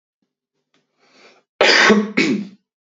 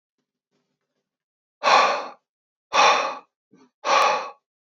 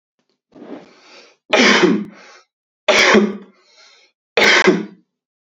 {"cough_length": "3.0 s", "cough_amplitude": 29334, "cough_signal_mean_std_ratio": 0.41, "exhalation_length": "4.7 s", "exhalation_amplitude": 23357, "exhalation_signal_mean_std_ratio": 0.4, "three_cough_length": "5.5 s", "three_cough_amplitude": 30149, "three_cough_signal_mean_std_ratio": 0.44, "survey_phase": "beta (2021-08-13 to 2022-03-07)", "age": "18-44", "gender": "Male", "wearing_mask": "No", "symptom_none": true, "smoker_status": "Ex-smoker", "respiratory_condition_asthma": false, "respiratory_condition_other": false, "recruitment_source": "REACT", "submission_delay": "2 days", "covid_test_result": "Negative", "covid_test_method": "RT-qPCR", "influenza_a_test_result": "Negative", "influenza_b_test_result": "Negative"}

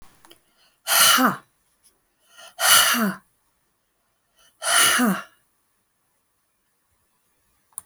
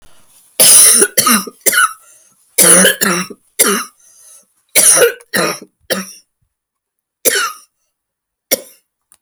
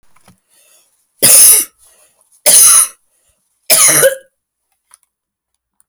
{"exhalation_length": "7.9 s", "exhalation_amplitude": 28097, "exhalation_signal_mean_std_ratio": 0.37, "cough_length": "9.2 s", "cough_amplitude": 32768, "cough_signal_mean_std_ratio": 0.46, "three_cough_length": "5.9 s", "three_cough_amplitude": 32768, "three_cough_signal_mean_std_ratio": 0.4, "survey_phase": "alpha (2021-03-01 to 2021-08-12)", "age": "45-64", "gender": "Female", "wearing_mask": "No", "symptom_none": true, "smoker_status": "Ex-smoker", "respiratory_condition_asthma": false, "respiratory_condition_other": false, "recruitment_source": "REACT", "submission_delay": "2 days", "covid_test_result": "Negative", "covid_test_method": "RT-qPCR"}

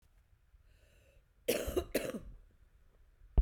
{"cough_length": "3.4 s", "cough_amplitude": 4938, "cough_signal_mean_std_ratio": 0.31, "survey_phase": "beta (2021-08-13 to 2022-03-07)", "age": "45-64", "gender": "Female", "wearing_mask": "No", "symptom_cough_any": true, "symptom_runny_or_blocked_nose": true, "symptom_sore_throat": true, "symptom_diarrhoea": true, "symptom_fatigue": true, "symptom_headache": true, "symptom_change_to_sense_of_smell_or_taste": true, "symptom_loss_of_taste": true, "symptom_onset": "4 days", "smoker_status": "Current smoker (1 to 10 cigarettes per day)", "respiratory_condition_asthma": false, "respiratory_condition_other": false, "recruitment_source": "Test and Trace", "submission_delay": "2 days", "covid_test_result": "Positive", "covid_test_method": "RT-qPCR"}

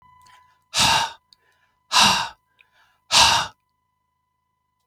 {"exhalation_length": "4.9 s", "exhalation_amplitude": 32766, "exhalation_signal_mean_std_ratio": 0.37, "survey_phase": "beta (2021-08-13 to 2022-03-07)", "age": "45-64", "gender": "Male", "wearing_mask": "No", "symptom_fatigue": true, "smoker_status": "Never smoked", "respiratory_condition_asthma": false, "respiratory_condition_other": false, "recruitment_source": "REACT", "submission_delay": "1 day", "covid_test_result": "Negative", "covid_test_method": "RT-qPCR", "influenza_a_test_result": "Negative", "influenza_b_test_result": "Negative"}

